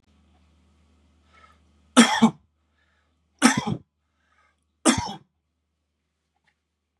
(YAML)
three_cough_length: 7.0 s
three_cough_amplitude: 29652
three_cough_signal_mean_std_ratio: 0.24
survey_phase: beta (2021-08-13 to 2022-03-07)
age: 18-44
gender: Male
wearing_mask: 'No'
symptom_none: true
smoker_status: Current smoker (1 to 10 cigarettes per day)
respiratory_condition_asthma: false
respiratory_condition_other: false
recruitment_source: REACT
submission_delay: 4 days
covid_test_result: Negative
covid_test_method: RT-qPCR
influenza_a_test_result: Negative
influenza_b_test_result: Negative